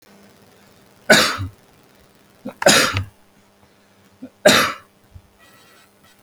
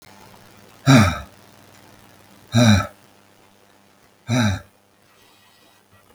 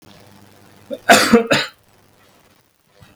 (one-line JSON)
{"three_cough_length": "6.2 s", "three_cough_amplitude": 32768, "three_cough_signal_mean_std_ratio": 0.32, "exhalation_length": "6.1 s", "exhalation_amplitude": 32766, "exhalation_signal_mean_std_ratio": 0.32, "cough_length": "3.2 s", "cough_amplitude": 32768, "cough_signal_mean_std_ratio": 0.32, "survey_phase": "beta (2021-08-13 to 2022-03-07)", "age": "65+", "gender": "Male", "wearing_mask": "No", "symptom_cough_any": true, "symptom_runny_or_blocked_nose": true, "symptom_sore_throat": true, "symptom_onset": "10 days", "smoker_status": "Never smoked", "respiratory_condition_asthma": false, "respiratory_condition_other": false, "recruitment_source": "REACT", "submission_delay": "2 days", "covid_test_result": "Negative", "covid_test_method": "RT-qPCR", "influenza_a_test_result": "Negative", "influenza_b_test_result": "Negative"}